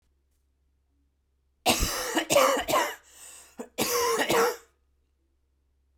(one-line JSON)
{"cough_length": "6.0 s", "cough_amplitude": 12720, "cough_signal_mean_std_ratio": 0.47, "survey_phase": "beta (2021-08-13 to 2022-03-07)", "age": "18-44", "gender": "Female", "wearing_mask": "No", "symptom_cough_any": true, "symptom_fatigue": true, "symptom_headache": true, "symptom_change_to_sense_of_smell_or_taste": true, "smoker_status": "Never smoked", "respiratory_condition_asthma": false, "respiratory_condition_other": false, "recruitment_source": "Test and Trace", "submission_delay": "2 days", "covid_test_result": "Positive", "covid_test_method": "RT-qPCR"}